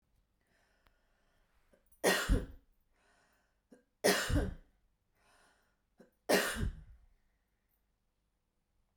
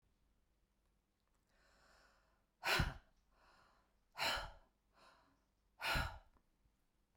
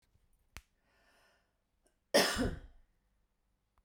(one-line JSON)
{"three_cough_length": "9.0 s", "three_cough_amplitude": 6516, "three_cough_signal_mean_std_ratio": 0.3, "exhalation_length": "7.2 s", "exhalation_amplitude": 2290, "exhalation_signal_mean_std_ratio": 0.3, "cough_length": "3.8 s", "cough_amplitude": 6175, "cough_signal_mean_std_ratio": 0.26, "survey_phase": "beta (2021-08-13 to 2022-03-07)", "age": "45-64", "gender": "Female", "wearing_mask": "No", "symptom_sore_throat": true, "smoker_status": "Ex-smoker", "respiratory_condition_asthma": false, "respiratory_condition_other": false, "recruitment_source": "REACT", "submission_delay": "1 day", "covid_test_result": "Negative", "covid_test_method": "RT-qPCR"}